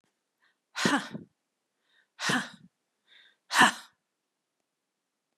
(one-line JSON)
{"exhalation_length": "5.4 s", "exhalation_amplitude": 15394, "exhalation_signal_mean_std_ratio": 0.27, "survey_phase": "beta (2021-08-13 to 2022-03-07)", "age": "65+", "gender": "Female", "wearing_mask": "No", "symptom_none": true, "smoker_status": "Ex-smoker", "respiratory_condition_asthma": false, "respiratory_condition_other": false, "recruitment_source": "REACT", "submission_delay": "2 days", "covid_test_result": "Negative", "covid_test_method": "RT-qPCR", "influenza_a_test_result": "Negative", "influenza_b_test_result": "Negative"}